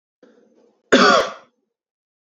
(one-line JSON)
{"cough_length": "2.4 s", "cough_amplitude": 27543, "cough_signal_mean_std_ratio": 0.31, "survey_phase": "beta (2021-08-13 to 2022-03-07)", "age": "18-44", "gender": "Male", "wearing_mask": "No", "symptom_cough_any": true, "symptom_sore_throat": true, "symptom_fatigue": true, "symptom_headache": true, "symptom_onset": "9 days", "smoker_status": "Ex-smoker", "respiratory_condition_asthma": false, "respiratory_condition_other": false, "recruitment_source": "REACT", "submission_delay": "1 day", "covid_test_result": "Positive", "covid_test_method": "RT-qPCR", "covid_ct_value": 34.0, "covid_ct_gene": "E gene", "influenza_a_test_result": "Negative", "influenza_b_test_result": "Negative"}